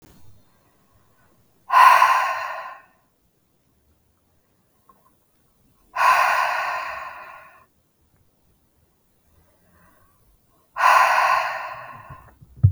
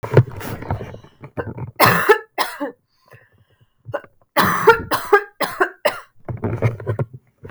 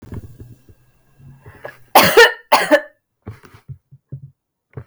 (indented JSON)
{
  "exhalation_length": "12.7 s",
  "exhalation_amplitude": 32322,
  "exhalation_signal_mean_std_ratio": 0.36,
  "three_cough_length": "7.5 s",
  "three_cough_amplitude": 32768,
  "three_cough_signal_mean_std_ratio": 0.45,
  "cough_length": "4.9 s",
  "cough_amplitude": 32768,
  "cough_signal_mean_std_ratio": 0.31,
  "survey_phase": "beta (2021-08-13 to 2022-03-07)",
  "age": "18-44",
  "gender": "Female",
  "wearing_mask": "No",
  "symptom_cough_any": true,
  "symptom_new_continuous_cough": true,
  "symptom_shortness_of_breath": true,
  "symptom_fatigue": true,
  "symptom_fever_high_temperature": true,
  "symptom_headache": true,
  "smoker_status": "Never smoked",
  "respiratory_condition_asthma": true,
  "respiratory_condition_other": false,
  "recruitment_source": "Test and Trace",
  "submission_delay": "0 days",
  "covid_test_result": "Positive",
  "covid_test_method": "LFT"
}